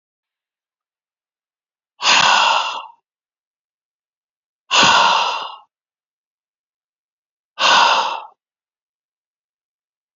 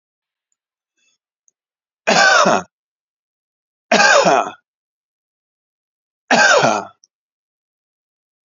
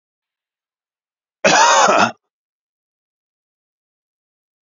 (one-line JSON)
{"exhalation_length": "10.2 s", "exhalation_amplitude": 32113, "exhalation_signal_mean_std_ratio": 0.36, "three_cough_length": "8.4 s", "three_cough_amplitude": 31139, "three_cough_signal_mean_std_ratio": 0.36, "cough_length": "4.7 s", "cough_amplitude": 32031, "cough_signal_mean_std_ratio": 0.3, "survey_phase": "beta (2021-08-13 to 2022-03-07)", "age": "65+", "gender": "Male", "wearing_mask": "No", "symptom_none": true, "smoker_status": "Never smoked", "respiratory_condition_asthma": false, "respiratory_condition_other": false, "recruitment_source": "REACT", "submission_delay": "1 day", "covid_test_result": "Negative", "covid_test_method": "RT-qPCR"}